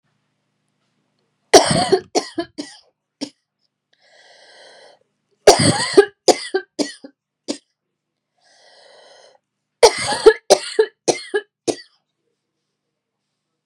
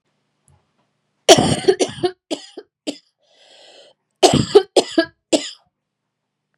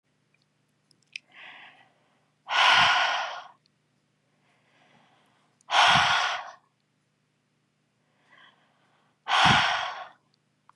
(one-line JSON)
{"three_cough_length": "13.7 s", "three_cough_amplitude": 32768, "three_cough_signal_mean_std_ratio": 0.27, "cough_length": "6.6 s", "cough_amplitude": 32768, "cough_signal_mean_std_ratio": 0.3, "exhalation_length": "10.8 s", "exhalation_amplitude": 15687, "exhalation_signal_mean_std_ratio": 0.36, "survey_phase": "beta (2021-08-13 to 2022-03-07)", "age": "18-44", "gender": "Female", "wearing_mask": "No", "symptom_none": true, "smoker_status": "Never smoked", "respiratory_condition_asthma": false, "respiratory_condition_other": false, "recruitment_source": "REACT", "submission_delay": "0 days", "covid_test_result": "Negative", "covid_test_method": "RT-qPCR", "influenza_a_test_result": "Negative", "influenza_b_test_result": "Negative"}